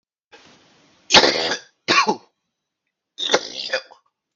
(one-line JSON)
{"cough_length": "4.4 s", "cough_amplitude": 32768, "cough_signal_mean_std_ratio": 0.35, "survey_phase": "beta (2021-08-13 to 2022-03-07)", "age": "45-64", "gender": "Male", "wearing_mask": "No", "symptom_cough_any": true, "symptom_runny_or_blocked_nose": true, "symptom_sore_throat": true, "symptom_onset": "3 days", "smoker_status": "Ex-smoker", "respiratory_condition_asthma": false, "respiratory_condition_other": false, "recruitment_source": "Test and Trace", "submission_delay": "1 day", "covid_test_result": "Positive", "covid_test_method": "ePCR"}